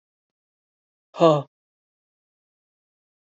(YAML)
exhalation_length: 3.3 s
exhalation_amplitude: 23802
exhalation_signal_mean_std_ratio: 0.19
survey_phase: alpha (2021-03-01 to 2021-08-12)
age: 45-64
gender: Female
wearing_mask: 'No'
symptom_cough_any: true
symptom_abdominal_pain: true
symptom_fatigue: true
symptom_fever_high_temperature: true
symptom_headache: true
symptom_change_to_sense_of_smell_or_taste: true
symptom_loss_of_taste: true
symptom_onset: 4 days
smoker_status: Ex-smoker
respiratory_condition_asthma: false
respiratory_condition_other: false
recruitment_source: Test and Trace
submission_delay: 1 day
covid_test_result: Positive
covid_test_method: RT-qPCR
covid_ct_value: 14.0
covid_ct_gene: N gene
covid_ct_mean: 14.4
covid_viral_load: 19000000 copies/ml
covid_viral_load_category: High viral load (>1M copies/ml)